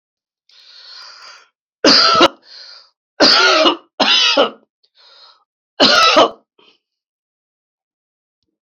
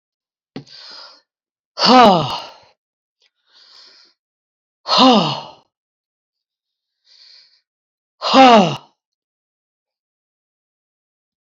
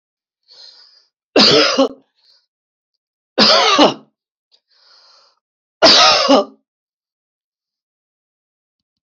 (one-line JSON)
{"cough_length": "8.6 s", "cough_amplitude": 31519, "cough_signal_mean_std_ratio": 0.41, "exhalation_length": "11.4 s", "exhalation_amplitude": 31353, "exhalation_signal_mean_std_ratio": 0.28, "three_cough_length": "9.0 s", "three_cough_amplitude": 32768, "three_cough_signal_mean_std_ratio": 0.36, "survey_phase": "alpha (2021-03-01 to 2021-08-12)", "age": "65+", "gender": "Male", "wearing_mask": "No", "symptom_none": true, "smoker_status": "Never smoked", "respiratory_condition_asthma": false, "respiratory_condition_other": false, "recruitment_source": "REACT", "submission_delay": "1 day", "covid_test_result": "Negative", "covid_test_method": "RT-qPCR"}